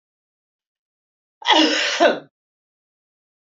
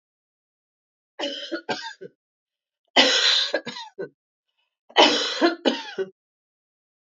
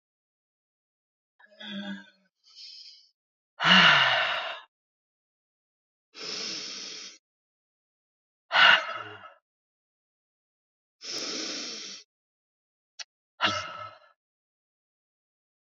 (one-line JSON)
{"cough_length": "3.6 s", "cough_amplitude": 27133, "cough_signal_mean_std_ratio": 0.34, "three_cough_length": "7.2 s", "three_cough_amplitude": 25993, "three_cough_signal_mean_std_ratio": 0.38, "exhalation_length": "15.7 s", "exhalation_amplitude": 20566, "exhalation_signal_mean_std_ratio": 0.29, "survey_phase": "beta (2021-08-13 to 2022-03-07)", "age": "45-64", "gender": "Female", "wearing_mask": "No", "symptom_runny_or_blocked_nose": true, "symptom_fatigue": true, "symptom_headache": true, "symptom_onset": "3 days", "smoker_status": "Never smoked", "respiratory_condition_asthma": false, "respiratory_condition_other": false, "recruitment_source": "Test and Trace", "submission_delay": "2 days", "covid_test_result": "Positive", "covid_test_method": "RT-qPCR", "covid_ct_value": 20.2, "covid_ct_gene": "ORF1ab gene", "covid_ct_mean": 20.7, "covid_viral_load": "160000 copies/ml", "covid_viral_load_category": "Low viral load (10K-1M copies/ml)"}